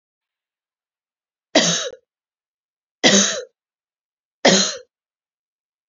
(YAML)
three_cough_length: 5.9 s
three_cough_amplitude: 31057
three_cough_signal_mean_std_ratio: 0.3
survey_phase: beta (2021-08-13 to 2022-03-07)
age: 45-64
gender: Female
wearing_mask: 'No'
symptom_runny_or_blocked_nose: true
smoker_status: Never smoked
respiratory_condition_asthma: false
respiratory_condition_other: false
recruitment_source: REACT
submission_delay: 2 days
covid_test_result: Negative
covid_test_method: RT-qPCR